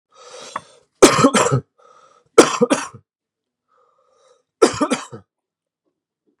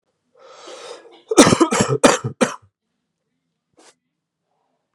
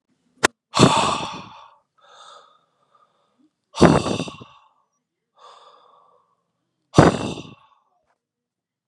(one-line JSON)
{"three_cough_length": "6.4 s", "three_cough_amplitude": 32768, "three_cough_signal_mean_std_ratio": 0.31, "cough_length": "4.9 s", "cough_amplitude": 32768, "cough_signal_mean_std_ratio": 0.3, "exhalation_length": "8.9 s", "exhalation_amplitude": 32768, "exhalation_signal_mean_std_ratio": 0.27, "survey_phase": "beta (2021-08-13 to 2022-03-07)", "age": "18-44", "gender": "Male", "wearing_mask": "No", "symptom_none": true, "smoker_status": "Never smoked", "respiratory_condition_asthma": true, "respiratory_condition_other": false, "recruitment_source": "Test and Trace", "submission_delay": "2 days", "covid_test_result": "Positive", "covid_test_method": "RT-qPCR", "covid_ct_value": 17.2, "covid_ct_gene": "ORF1ab gene", "covid_ct_mean": 17.6, "covid_viral_load": "1700000 copies/ml", "covid_viral_load_category": "High viral load (>1M copies/ml)"}